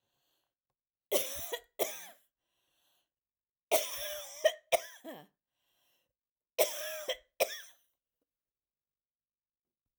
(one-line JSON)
{"three_cough_length": "10.0 s", "three_cough_amplitude": 8912, "three_cough_signal_mean_std_ratio": 0.3, "survey_phase": "alpha (2021-03-01 to 2021-08-12)", "age": "45-64", "gender": "Female", "wearing_mask": "No", "symptom_cough_any": true, "symptom_headache": true, "smoker_status": "Never smoked", "respiratory_condition_asthma": false, "respiratory_condition_other": false, "recruitment_source": "REACT", "submission_delay": "7 days", "covid_test_result": "Negative", "covid_test_method": "RT-qPCR"}